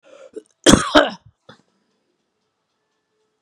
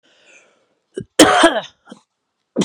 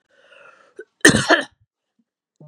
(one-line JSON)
{"cough_length": "3.4 s", "cough_amplitude": 32768, "cough_signal_mean_std_ratio": 0.24, "three_cough_length": "2.6 s", "three_cough_amplitude": 32768, "three_cough_signal_mean_std_ratio": 0.33, "exhalation_length": "2.5 s", "exhalation_amplitude": 32768, "exhalation_signal_mean_std_ratio": 0.27, "survey_phase": "beta (2021-08-13 to 2022-03-07)", "age": "45-64", "gender": "Female", "wearing_mask": "No", "symptom_none": true, "smoker_status": "Never smoked", "respiratory_condition_asthma": false, "respiratory_condition_other": false, "recruitment_source": "REACT", "submission_delay": "0 days", "covid_test_result": "Negative", "covid_test_method": "RT-qPCR", "influenza_a_test_result": "Negative", "influenza_b_test_result": "Negative"}